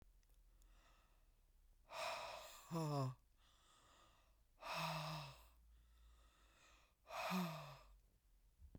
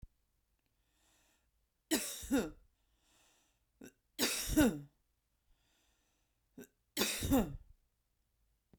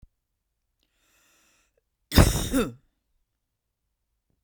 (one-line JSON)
{"exhalation_length": "8.8 s", "exhalation_amplitude": 757, "exhalation_signal_mean_std_ratio": 0.5, "three_cough_length": "8.8 s", "three_cough_amplitude": 5521, "three_cough_signal_mean_std_ratio": 0.32, "cough_length": "4.4 s", "cough_amplitude": 29519, "cough_signal_mean_std_ratio": 0.23, "survey_phase": "beta (2021-08-13 to 2022-03-07)", "age": "18-44", "gender": "Female", "wearing_mask": "No", "symptom_none": true, "smoker_status": "Current smoker (1 to 10 cigarettes per day)", "respiratory_condition_asthma": false, "respiratory_condition_other": false, "recruitment_source": "REACT", "submission_delay": "3 days", "covid_test_result": "Negative", "covid_test_method": "RT-qPCR", "influenza_a_test_result": "Negative", "influenza_b_test_result": "Negative"}